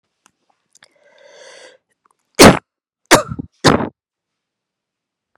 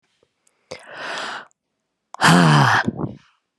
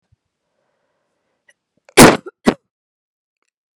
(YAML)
three_cough_length: 5.4 s
three_cough_amplitude: 32768
three_cough_signal_mean_std_ratio: 0.23
exhalation_length: 3.6 s
exhalation_amplitude: 31475
exhalation_signal_mean_std_ratio: 0.42
cough_length: 3.8 s
cough_amplitude: 32768
cough_signal_mean_std_ratio: 0.2
survey_phase: beta (2021-08-13 to 2022-03-07)
age: 45-64
gender: Female
wearing_mask: 'No'
symptom_cough_any: true
symptom_runny_or_blocked_nose: true
symptom_sore_throat: true
symptom_fatigue: true
symptom_change_to_sense_of_smell_or_taste: true
symptom_onset: 8 days
smoker_status: Never smoked
respiratory_condition_asthma: false
respiratory_condition_other: false
recruitment_source: REACT
submission_delay: 2 days
covid_test_result: Positive
covid_test_method: RT-qPCR
covid_ct_value: 19.0
covid_ct_gene: E gene